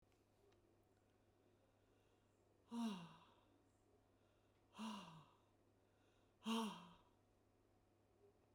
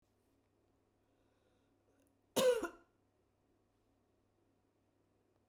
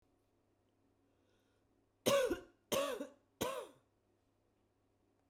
{"exhalation_length": "8.5 s", "exhalation_amplitude": 635, "exhalation_signal_mean_std_ratio": 0.35, "cough_length": "5.5 s", "cough_amplitude": 3360, "cough_signal_mean_std_ratio": 0.2, "three_cough_length": "5.3 s", "three_cough_amplitude": 4674, "three_cough_signal_mean_std_ratio": 0.32, "survey_phase": "beta (2021-08-13 to 2022-03-07)", "age": "65+", "gender": "Female", "wearing_mask": "Yes", "symptom_cough_any": true, "symptom_runny_or_blocked_nose": true, "symptom_other": true, "smoker_status": "Never smoked", "respiratory_condition_asthma": false, "respiratory_condition_other": false, "recruitment_source": "REACT", "submission_delay": "2 days", "covid_test_result": "Negative", "covid_test_method": "RT-qPCR", "influenza_a_test_result": "Unknown/Void", "influenza_b_test_result": "Unknown/Void"}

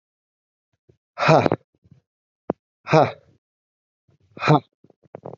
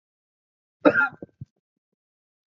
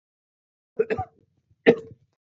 {"exhalation_length": "5.4 s", "exhalation_amplitude": 32768, "exhalation_signal_mean_std_ratio": 0.26, "cough_length": "2.5 s", "cough_amplitude": 27289, "cough_signal_mean_std_ratio": 0.22, "three_cough_length": "2.2 s", "three_cough_amplitude": 24770, "three_cough_signal_mean_std_ratio": 0.24, "survey_phase": "beta (2021-08-13 to 2022-03-07)", "age": "18-44", "gender": "Male", "wearing_mask": "No", "symptom_cough_any": true, "symptom_new_continuous_cough": true, "symptom_sore_throat": true, "symptom_fatigue": true, "symptom_fever_high_temperature": true, "symptom_headache": true, "symptom_onset": "3 days", "smoker_status": "Never smoked", "respiratory_condition_asthma": false, "respiratory_condition_other": false, "recruitment_source": "Test and Trace", "submission_delay": "1 day", "covid_test_result": "Positive", "covid_test_method": "RT-qPCR"}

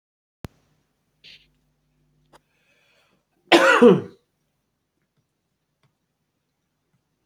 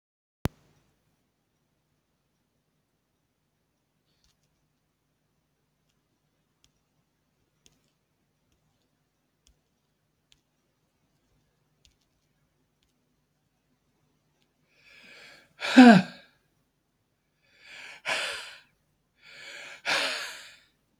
{"cough_length": "7.3 s", "cough_amplitude": 26890, "cough_signal_mean_std_ratio": 0.2, "exhalation_length": "21.0 s", "exhalation_amplitude": 25031, "exhalation_signal_mean_std_ratio": 0.14, "survey_phase": "beta (2021-08-13 to 2022-03-07)", "age": "65+", "gender": "Male", "wearing_mask": "No", "symptom_none": true, "smoker_status": "Ex-smoker", "respiratory_condition_asthma": false, "respiratory_condition_other": false, "recruitment_source": "REACT", "submission_delay": "6 days", "covid_test_result": "Negative", "covid_test_method": "RT-qPCR", "influenza_a_test_result": "Negative", "influenza_b_test_result": "Negative"}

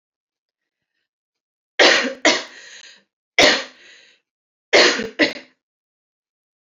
{"three_cough_length": "6.7 s", "three_cough_amplitude": 30847, "three_cough_signal_mean_std_ratio": 0.32, "survey_phase": "beta (2021-08-13 to 2022-03-07)", "age": "18-44", "gender": "Female", "wearing_mask": "No", "symptom_cough_any": true, "symptom_new_continuous_cough": true, "symptom_runny_or_blocked_nose": true, "symptom_shortness_of_breath": true, "symptom_sore_throat": true, "symptom_onset": "8 days", "smoker_status": "Never smoked", "respiratory_condition_asthma": false, "respiratory_condition_other": false, "recruitment_source": "REACT", "submission_delay": "0 days", "covid_test_result": "Positive", "covid_test_method": "RT-qPCR", "covid_ct_value": 24.6, "covid_ct_gene": "E gene", "influenza_a_test_result": "Negative", "influenza_b_test_result": "Negative"}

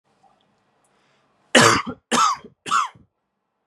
{"three_cough_length": "3.7 s", "three_cough_amplitude": 32655, "three_cough_signal_mean_std_ratio": 0.35, "survey_phase": "beta (2021-08-13 to 2022-03-07)", "age": "18-44", "gender": "Male", "wearing_mask": "No", "symptom_change_to_sense_of_smell_or_taste": true, "symptom_loss_of_taste": true, "symptom_onset": "2 days", "smoker_status": "Ex-smoker", "respiratory_condition_asthma": false, "respiratory_condition_other": false, "recruitment_source": "Test and Trace", "submission_delay": "2 days", "covid_test_result": "Positive", "covid_test_method": "ePCR"}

